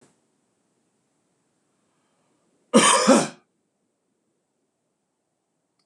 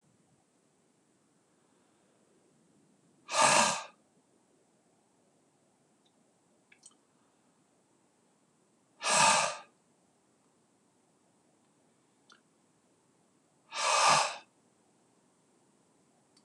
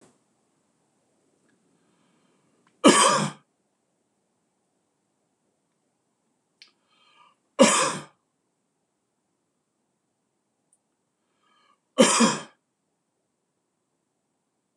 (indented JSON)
{
  "cough_length": "5.9 s",
  "cough_amplitude": 25397,
  "cough_signal_mean_std_ratio": 0.23,
  "exhalation_length": "16.4 s",
  "exhalation_amplitude": 11866,
  "exhalation_signal_mean_std_ratio": 0.25,
  "three_cough_length": "14.8 s",
  "three_cough_amplitude": 25962,
  "three_cough_signal_mean_std_ratio": 0.21,
  "survey_phase": "beta (2021-08-13 to 2022-03-07)",
  "age": "45-64",
  "gender": "Male",
  "wearing_mask": "No",
  "symptom_none": true,
  "smoker_status": "Never smoked",
  "respiratory_condition_asthma": false,
  "respiratory_condition_other": false,
  "recruitment_source": "REACT",
  "submission_delay": "1 day",
  "covid_test_result": "Negative",
  "covid_test_method": "RT-qPCR",
  "influenza_a_test_result": "Negative",
  "influenza_b_test_result": "Negative"
}